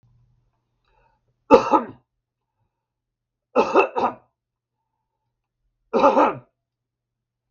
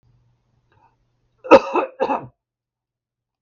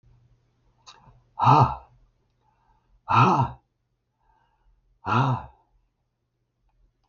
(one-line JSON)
{"three_cough_length": "7.5 s", "three_cough_amplitude": 32768, "three_cough_signal_mean_std_ratio": 0.28, "cough_length": "3.4 s", "cough_amplitude": 32768, "cough_signal_mean_std_ratio": 0.23, "exhalation_length": "7.1 s", "exhalation_amplitude": 20345, "exhalation_signal_mean_std_ratio": 0.31, "survey_phase": "beta (2021-08-13 to 2022-03-07)", "age": "65+", "gender": "Male", "wearing_mask": "No", "symptom_none": true, "smoker_status": "Never smoked", "respiratory_condition_asthma": false, "respiratory_condition_other": false, "recruitment_source": "REACT", "submission_delay": "2 days", "covid_test_result": "Negative", "covid_test_method": "RT-qPCR", "influenza_a_test_result": "Negative", "influenza_b_test_result": "Negative"}